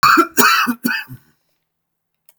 {"cough_length": "2.4 s", "cough_amplitude": 32768, "cough_signal_mean_std_ratio": 0.47, "survey_phase": "beta (2021-08-13 to 2022-03-07)", "age": "45-64", "gender": "Male", "wearing_mask": "No", "symptom_none": true, "smoker_status": "Ex-smoker", "respiratory_condition_asthma": false, "respiratory_condition_other": false, "recruitment_source": "REACT", "submission_delay": "1 day", "covid_test_result": "Negative", "covid_test_method": "RT-qPCR"}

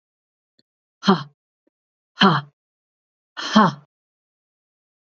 {"exhalation_length": "5.0 s", "exhalation_amplitude": 27236, "exhalation_signal_mean_std_ratio": 0.26, "survey_phase": "beta (2021-08-13 to 2022-03-07)", "age": "45-64", "gender": "Female", "wearing_mask": "No", "symptom_cough_any": true, "symptom_runny_or_blocked_nose": true, "symptom_fatigue": true, "symptom_headache": true, "symptom_change_to_sense_of_smell_or_taste": true, "smoker_status": "Ex-smoker", "respiratory_condition_asthma": false, "respiratory_condition_other": false, "recruitment_source": "Test and Trace", "submission_delay": "1 day", "covid_test_result": "Positive", "covid_test_method": "RT-qPCR", "covid_ct_value": 19.7, "covid_ct_gene": "ORF1ab gene", "covid_ct_mean": 20.7, "covid_viral_load": "170000 copies/ml", "covid_viral_load_category": "Low viral load (10K-1M copies/ml)"}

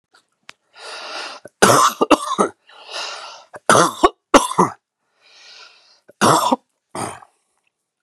{"three_cough_length": "8.0 s", "three_cough_amplitude": 32768, "three_cough_signal_mean_std_ratio": 0.37, "survey_phase": "beta (2021-08-13 to 2022-03-07)", "age": "45-64", "gender": "Male", "wearing_mask": "No", "symptom_none": true, "smoker_status": "Never smoked", "respiratory_condition_asthma": false, "respiratory_condition_other": false, "recruitment_source": "REACT", "submission_delay": "2 days", "covid_test_result": "Negative", "covid_test_method": "RT-qPCR", "influenza_a_test_result": "Negative", "influenza_b_test_result": "Negative"}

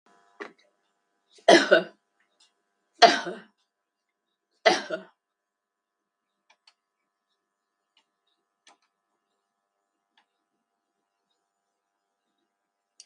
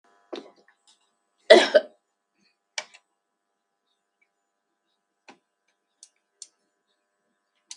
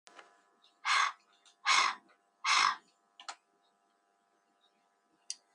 {"three_cough_length": "13.1 s", "three_cough_amplitude": 32768, "three_cough_signal_mean_std_ratio": 0.16, "cough_length": "7.8 s", "cough_amplitude": 32316, "cough_signal_mean_std_ratio": 0.14, "exhalation_length": "5.5 s", "exhalation_amplitude": 7459, "exhalation_signal_mean_std_ratio": 0.33, "survey_phase": "beta (2021-08-13 to 2022-03-07)", "age": "45-64", "gender": "Female", "wearing_mask": "No", "symptom_none": true, "smoker_status": "Never smoked", "respiratory_condition_asthma": false, "respiratory_condition_other": true, "recruitment_source": "REACT", "submission_delay": "1 day", "covid_test_result": "Negative", "covid_test_method": "RT-qPCR"}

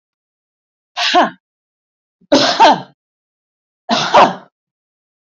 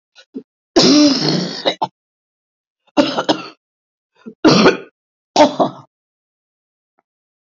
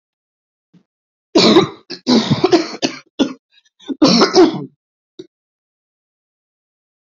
{"exhalation_length": "5.4 s", "exhalation_amplitude": 28974, "exhalation_signal_mean_std_ratio": 0.37, "three_cough_length": "7.4 s", "three_cough_amplitude": 32767, "three_cough_signal_mean_std_ratio": 0.39, "cough_length": "7.1 s", "cough_amplitude": 32768, "cough_signal_mean_std_ratio": 0.38, "survey_phase": "beta (2021-08-13 to 2022-03-07)", "age": "65+", "gender": "Female", "wearing_mask": "No", "symptom_cough_any": true, "symptom_runny_or_blocked_nose": true, "symptom_sore_throat": true, "symptom_headache": true, "smoker_status": "Ex-smoker", "respiratory_condition_asthma": false, "respiratory_condition_other": false, "recruitment_source": "Test and Trace", "submission_delay": "1 day", "covid_test_result": "Positive", "covid_test_method": "RT-qPCR"}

